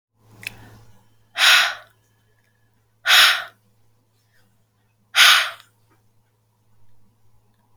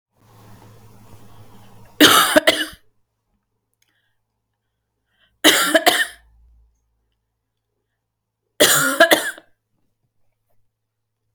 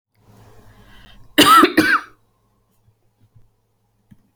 {"exhalation_length": "7.8 s", "exhalation_amplitude": 31673, "exhalation_signal_mean_std_ratio": 0.3, "three_cough_length": "11.3 s", "three_cough_amplitude": 32768, "three_cough_signal_mean_std_ratio": 0.3, "cough_length": "4.4 s", "cough_amplitude": 30689, "cough_signal_mean_std_ratio": 0.3, "survey_phase": "alpha (2021-03-01 to 2021-08-12)", "age": "18-44", "gender": "Female", "wearing_mask": "No", "symptom_headache": true, "smoker_status": "Ex-smoker", "respiratory_condition_asthma": false, "respiratory_condition_other": false, "recruitment_source": "Test and Trace", "submission_delay": "2 days", "covid_test_result": "Positive", "covid_test_method": "RT-qPCR", "covid_ct_value": 28.4, "covid_ct_gene": "ORF1ab gene"}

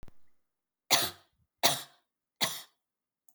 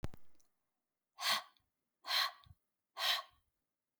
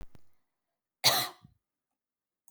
{"three_cough_length": "3.3 s", "three_cough_amplitude": 13652, "three_cough_signal_mean_std_ratio": 0.3, "exhalation_length": "4.0 s", "exhalation_amplitude": 2731, "exhalation_signal_mean_std_ratio": 0.39, "cough_length": "2.5 s", "cough_amplitude": 13569, "cough_signal_mean_std_ratio": 0.26, "survey_phase": "beta (2021-08-13 to 2022-03-07)", "age": "45-64", "gender": "Female", "wearing_mask": "No", "symptom_none": true, "smoker_status": "Never smoked", "respiratory_condition_asthma": false, "respiratory_condition_other": false, "recruitment_source": "REACT", "submission_delay": "2 days", "covid_test_result": "Negative", "covid_test_method": "RT-qPCR"}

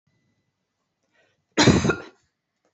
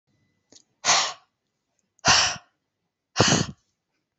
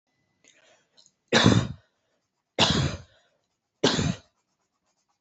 {"cough_length": "2.7 s", "cough_amplitude": 23390, "cough_signal_mean_std_ratio": 0.28, "exhalation_length": "4.2 s", "exhalation_amplitude": 24019, "exhalation_signal_mean_std_ratio": 0.35, "three_cough_length": "5.2 s", "three_cough_amplitude": 21922, "three_cough_signal_mean_std_ratio": 0.34, "survey_phase": "beta (2021-08-13 to 2022-03-07)", "age": "18-44", "gender": "Female", "wearing_mask": "No", "symptom_runny_or_blocked_nose": true, "smoker_status": "Never smoked", "respiratory_condition_asthma": false, "respiratory_condition_other": false, "recruitment_source": "REACT", "submission_delay": "1 day", "covid_test_result": "Negative", "covid_test_method": "RT-qPCR", "covid_ct_value": 38.4, "covid_ct_gene": "N gene", "influenza_a_test_result": "Negative", "influenza_b_test_result": "Negative"}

